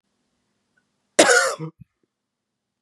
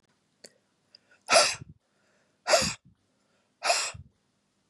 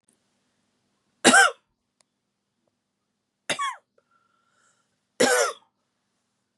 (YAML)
cough_length: 2.8 s
cough_amplitude: 31852
cough_signal_mean_std_ratio: 0.28
exhalation_length: 4.7 s
exhalation_amplitude: 16278
exhalation_signal_mean_std_ratio: 0.31
three_cough_length: 6.6 s
three_cough_amplitude: 30528
three_cough_signal_mean_std_ratio: 0.25
survey_phase: beta (2021-08-13 to 2022-03-07)
age: 45-64
gender: Female
wearing_mask: 'No'
symptom_runny_or_blocked_nose: true
symptom_onset: 12 days
smoker_status: Ex-smoker
respiratory_condition_asthma: true
respiratory_condition_other: false
recruitment_source: REACT
submission_delay: 3 days
covid_test_result: Negative
covid_test_method: RT-qPCR
influenza_a_test_result: Negative
influenza_b_test_result: Negative